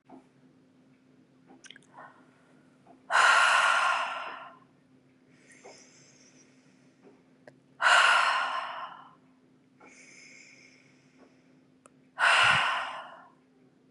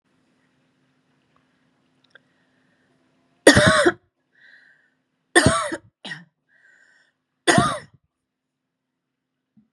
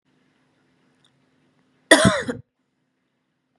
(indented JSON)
{
  "exhalation_length": "13.9 s",
  "exhalation_amplitude": 11724,
  "exhalation_signal_mean_std_ratio": 0.38,
  "three_cough_length": "9.7 s",
  "three_cough_amplitude": 32768,
  "three_cough_signal_mean_std_ratio": 0.25,
  "cough_length": "3.6 s",
  "cough_amplitude": 32768,
  "cough_signal_mean_std_ratio": 0.22,
  "survey_phase": "beta (2021-08-13 to 2022-03-07)",
  "age": "45-64",
  "gender": "Female",
  "wearing_mask": "No",
  "symptom_sore_throat": true,
  "smoker_status": "Never smoked",
  "respiratory_condition_asthma": false,
  "respiratory_condition_other": false,
  "recruitment_source": "Test and Trace",
  "submission_delay": "2 days",
  "covid_test_result": "Negative",
  "covid_test_method": "RT-qPCR"
}